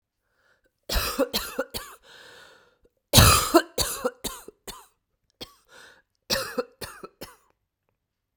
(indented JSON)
{
  "cough_length": "8.4 s",
  "cough_amplitude": 32768,
  "cough_signal_mean_std_ratio": 0.31,
  "survey_phase": "beta (2021-08-13 to 2022-03-07)",
  "age": "45-64",
  "gender": "Female",
  "wearing_mask": "No",
  "symptom_new_continuous_cough": true,
  "symptom_runny_or_blocked_nose": true,
  "symptom_shortness_of_breath": true,
  "symptom_sore_throat": true,
  "symptom_fatigue": true,
  "symptom_change_to_sense_of_smell_or_taste": true,
  "symptom_loss_of_taste": true,
  "symptom_onset": "4 days",
  "smoker_status": "Never smoked",
  "respiratory_condition_asthma": false,
  "respiratory_condition_other": false,
  "recruitment_source": "Test and Trace",
  "submission_delay": "2 days",
  "covid_test_result": "Positive",
  "covid_test_method": "RT-qPCR",
  "covid_ct_value": 20.3,
  "covid_ct_gene": "ORF1ab gene"
}